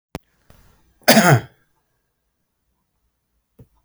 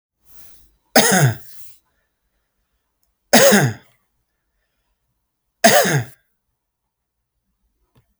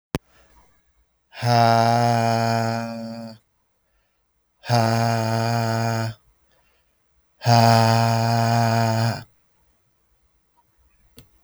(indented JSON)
{
  "cough_length": "3.8 s",
  "cough_amplitude": 32768,
  "cough_signal_mean_std_ratio": 0.24,
  "three_cough_length": "8.2 s",
  "three_cough_amplitude": 32768,
  "three_cough_signal_mean_std_ratio": 0.31,
  "exhalation_length": "11.4 s",
  "exhalation_amplitude": 26949,
  "exhalation_signal_mean_std_ratio": 0.55,
  "survey_phase": "beta (2021-08-13 to 2022-03-07)",
  "age": "45-64",
  "gender": "Male",
  "wearing_mask": "No",
  "symptom_none": true,
  "smoker_status": "Never smoked",
  "respiratory_condition_asthma": false,
  "respiratory_condition_other": false,
  "recruitment_source": "REACT",
  "submission_delay": "3 days",
  "covid_test_result": "Negative",
  "covid_test_method": "RT-qPCR"
}